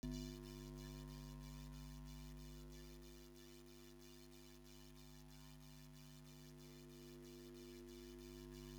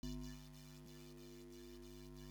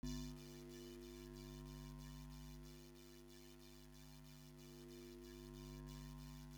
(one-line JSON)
{"exhalation_length": "8.8 s", "exhalation_amplitude": 568, "exhalation_signal_mean_std_ratio": 0.95, "cough_length": "2.3 s", "cough_amplitude": 659, "cough_signal_mean_std_ratio": 0.92, "three_cough_length": "6.6 s", "three_cough_amplitude": 591, "three_cough_signal_mean_std_ratio": 0.97, "survey_phase": "beta (2021-08-13 to 2022-03-07)", "age": "45-64", "gender": "Male", "wearing_mask": "No", "symptom_none": true, "symptom_onset": "2 days", "smoker_status": "Ex-smoker", "respiratory_condition_asthma": false, "respiratory_condition_other": false, "recruitment_source": "REACT", "submission_delay": "2 days", "covid_test_result": "Negative", "covid_test_method": "RT-qPCR"}